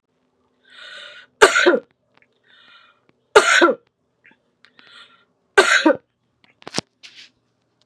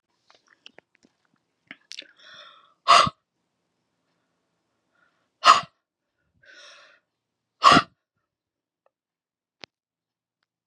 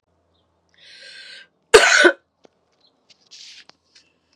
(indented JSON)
{
  "three_cough_length": "7.9 s",
  "three_cough_amplitude": 32768,
  "three_cough_signal_mean_std_ratio": 0.29,
  "exhalation_length": "10.7 s",
  "exhalation_amplitude": 28466,
  "exhalation_signal_mean_std_ratio": 0.18,
  "cough_length": "4.4 s",
  "cough_amplitude": 32768,
  "cough_signal_mean_std_ratio": 0.24,
  "survey_phase": "beta (2021-08-13 to 2022-03-07)",
  "age": "45-64",
  "gender": "Female",
  "wearing_mask": "No",
  "symptom_cough_any": true,
  "symptom_sore_throat": true,
  "symptom_fatigue": true,
  "symptom_fever_high_temperature": true,
  "symptom_headache": true,
  "symptom_onset": "3 days",
  "smoker_status": "Never smoked",
  "respiratory_condition_asthma": false,
  "respiratory_condition_other": false,
  "recruitment_source": "Test and Trace",
  "submission_delay": "1 day",
  "covid_test_result": "Positive",
  "covid_test_method": "RT-qPCR",
  "covid_ct_value": 22.4,
  "covid_ct_gene": "N gene"
}